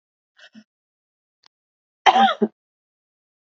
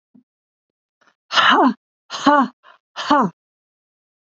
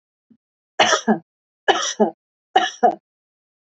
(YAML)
cough_length: 3.4 s
cough_amplitude: 28156
cough_signal_mean_std_ratio: 0.24
exhalation_length: 4.4 s
exhalation_amplitude: 32590
exhalation_signal_mean_std_ratio: 0.37
three_cough_length: 3.7 s
three_cough_amplitude: 26968
three_cough_signal_mean_std_ratio: 0.37
survey_phase: beta (2021-08-13 to 2022-03-07)
age: 65+
gender: Female
wearing_mask: 'No'
symptom_none: true
smoker_status: Never smoked
respiratory_condition_asthma: false
respiratory_condition_other: false
recruitment_source: REACT
submission_delay: 1 day
covid_test_result: Negative
covid_test_method: RT-qPCR
influenza_a_test_result: Negative
influenza_b_test_result: Negative